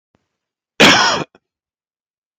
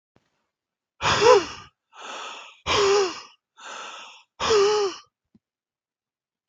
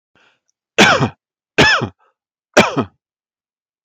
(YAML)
cough_length: 2.4 s
cough_amplitude: 32768
cough_signal_mean_std_ratio: 0.33
exhalation_length: 6.5 s
exhalation_amplitude: 25063
exhalation_signal_mean_std_ratio: 0.42
three_cough_length: 3.8 s
three_cough_amplitude: 32293
three_cough_signal_mean_std_ratio: 0.36
survey_phase: alpha (2021-03-01 to 2021-08-12)
age: 45-64
gender: Male
wearing_mask: 'No'
symptom_none: true
smoker_status: Ex-smoker
respiratory_condition_asthma: false
respiratory_condition_other: false
recruitment_source: REACT
submission_delay: 1 day
covid_test_result: Negative
covid_test_method: RT-qPCR